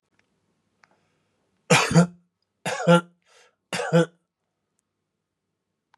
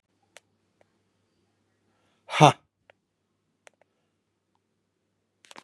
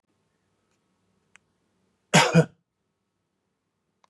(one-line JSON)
{"three_cough_length": "6.0 s", "three_cough_amplitude": 25388, "three_cough_signal_mean_std_ratio": 0.29, "exhalation_length": "5.6 s", "exhalation_amplitude": 31750, "exhalation_signal_mean_std_ratio": 0.12, "cough_length": "4.1 s", "cough_amplitude": 25764, "cough_signal_mean_std_ratio": 0.2, "survey_phase": "beta (2021-08-13 to 2022-03-07)", "age": "45-64", "gender": "Male", "wearing_mask": "No", "symptom_runny_or_blocked_nose": true, "symptom_fatigue": true, "smoker_status": "Ex-smoker", "respiratory_condition_asthma": false, "respiratory_condition_other": false, "recruitment_source": "Test and Trace", "submission_delay": "2 days", "covid_test_result": "Positive", "covid_test_method": "RT-qPCR", "covid_ct_value": 13.3, "covid_ct_gene": "ORF1ab gene"}